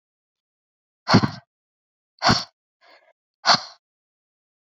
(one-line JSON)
{"exhalation_length": "4.8 s", "exhalation_amplitude": 28710, "exhalation_signal_mean_std_ratio": 0.24, "survey_phase": "beta (2021-08-13 to 2022-03-07)", "age": "18-44", "gender": "Female", "wearing_mask": "No", "symptom_cough_any": true, "symptom_fatigue": true, "symptom_headache": true, "symptom_onset": "12 days", "smoker_status": "Never smoked", "respiratory_condition_asthma": false, "respiratory_condition_other": false, "recruitment_source": "REACT", "submission_delay": "-1 day", "covid_test_result": "Negative", "covid_test_method": "RT-qPCR"}